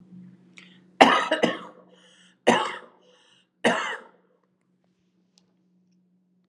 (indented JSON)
{
  "cough_length": "6.5 s",
  "cough_amplitude": 32768,
  "cough_signal_mean_std_ratio": 0.29,
  "survey_phase": "alpha (2021-03-01 to 2021-08-12)",
  "age": "45-64",
  "gender": "Female",
  "wearing_mask": "No",
  "symptom_none": true,
  "smoker_status": "Never smoked",
  "respiratory_condition_asthma": false,
  "respiratory_condition_other": false,
  "recruitment_source": "Test and Trace",
  "submission_delay": "0 days",
  "covid_test_result": "Negative",
  "covid_test_method": "LFT"
}